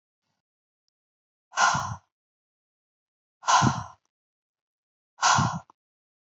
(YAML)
exhalation_length: 6.4 s
exhalation_amplitude: 15802
exhalation_signal_mean_std_ratio: 0.31
survey_phase: beta (2021-08-13 to 2022-03-07)
age: 45-64
gender: Female
wearing_mask: 'No'
symptom_none: true
smoker_status: Never smoked
respiratory_condition_asthma: true
respiratory_condition_other: false
recruitment_source: REACT
submission_delay: 2 days
covid_test_result: Negative
covid_test_method: RT-qPCR